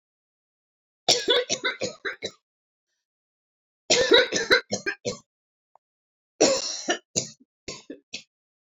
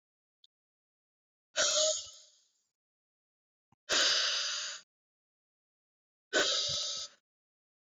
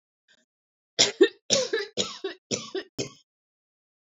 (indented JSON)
{
  "three_cough_length": "8.8 s",
  "three_cough_amplitude": 23379,
  "three_cough_signal_mean_std_ratio": 0.36,
  "exhalation_length": "7.9 s",
  "exhalation_amplitude": 5314,
  "exhalation_signal_mean_std_ratio": 0.41,
  "cough_length": "4.0 s",
  "cough_amplitude": 21468,
  "cough_signal_mean_std_ratio": 0.33,
  "survey_phase": "beta (2021-08-13 to 2022-03-07)",
  "age": "65+",
  "gender": "Female",
  "wearing_mask": "No",
  "symptom_none": true,
  "smoker_status": "Never smoked",
  "respiratory_condition_asthma": false,
  "respiratory_condition_other": false,
  "recruitment_source": "REACT",
  "submission_delay": "1 day",
  "covid_test_result": "Negative",
  "covid_test_method": "RT-qPCR"
}